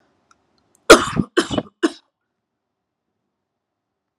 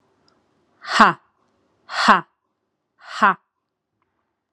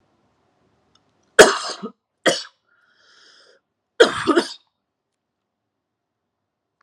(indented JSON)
{
  "three_cough_length": "4.2 s",
  "three_cough_amplitude": 32768,
  "three_cough_signal_mean_std_ratio": 0.21,
  "exhalation_length": "4.5 s",
  "exhalation_amplitude": 32768,
  "exhalation_signal_mean_std_ratio": 0.26,
  "cough_length": "6.8 s",
  "cough_amplitude": 32768,
  "cough_signal_mean_std_ratio": 0.22,
  "survey_phase": "alpha (2021-03-01 to 2021-08-12)",
  "age": "18-44",
  "gender": "Female",
  "wearing_mask": "Yes",
  "symptom_none": true,
  "smoker_status": "Never smoked",
  "respiratory_condition_asthma": false,
  "respiratory_condition_other": false,
  "recruitment_source": "Test and Trace",
  "submission_delay": "0 days",
  "covid_test_result": "Negative",
  "covid_test_method": "LFT"
}